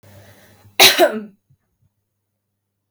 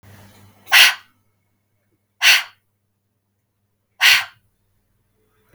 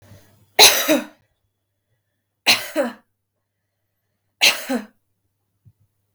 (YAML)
cough_length: 2.9 s
cough_amplitude: 32768
cough_signal_mean_std_ratio: 0.27
exhalation_length: 5.5 s
exhalation_amplitude: 32768
exhalation_signal_mean_std_ratio: 0.27
three_cough_length: 6.1 s
three_cough_amplitude: 32768
three_cough_signal_mean_std_ratio: 0.29
survey_phase: beta (2021-08-13 to 2022-03-07)
age: 18-44
gender: Female
wearing_mask: 'No'
symptom_runny_or_blocked_nose: true
symptom_onset: 4 days
smoker_status: Never smoked
respiratory_condition_asthma: false
respiratory_condition_other: false
recruitment_source: REACT
submission_delay: 1 day
covid_test_result: Negative
covid_test_method: RT-qPCR
influenza_a_test_result: Negative
influenza_b_test_result: Negative